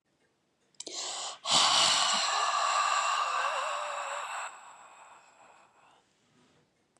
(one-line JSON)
{"exhalation_length": "7.0 s", "exhalation_amplitude": 9416, "exhalation_signal_mean_std_ratio": 0.61, "survey_phase": "beta (2021-08-13 to 2022-03-07)", "age": "45-64", "gender": "Female", "wearing_mask": "No", "symptom_none": true, "symptom_onset": "12 days", "smoker_status": "Ex-smoker", "respiratory_condition_asthma": true, "respiratory_condition_other": false, "recruitment_source": "REACT", "submission_delay": "3 days", "covid_test_result": "Negative", "covid_test_method": "RT-qPCR", "influenza_a_test_result": "Negative", "influenza_b_test_result": "Negative"}